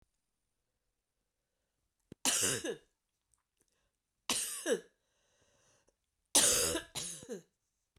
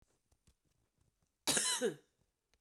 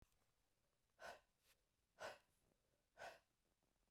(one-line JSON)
{"three_cough_length": "8.0 s", "three_cough_amplitude": 9626, "three_cough_signal_mean_std_ratio": 0.33, "cough_length": "2.6 s", "cough_amplitude": 4273, "cough_signal_mean_std_ratio": 0.34, "exhalation_length": "3.9 s", "exhalation_amplitude": 242, "exhalation_signal_mean_std_ratio": 0.35, "survey_phase": "beta (2021-08-13 to 2022-03-07)", "age": "45-64", "gender": "Female", "wearing_mask": "No", "symptom_cough_any": true, "symptom_runny_or_blocked_nose": true, "symptom_shortness_of_breath": true, "symptom_sore_throat": true, "symptom_fatigue": true, "symptom_fever_high_temperature": true, "symptom_headache": true, "symptom_onset": "4 days", "smoker_status": "Ex-smoker", "respiratory_condition_asthma": false, "respiratory_condition_other": false, "recruitment_source": "Test and Trace", "submission_delay": "2 days", "covid_test_result": "Positive", "covid_test_method": "RT-qPCR", "covid_ct_value": 26.2, "covid_ct_gene": "ORF1ab gene", "covid_ct_mean": 26.5, "covid_viral_load": "2100 copies/ml", "covid_viral_load_category": "Minimal viral load (< 10K copies/ml)"}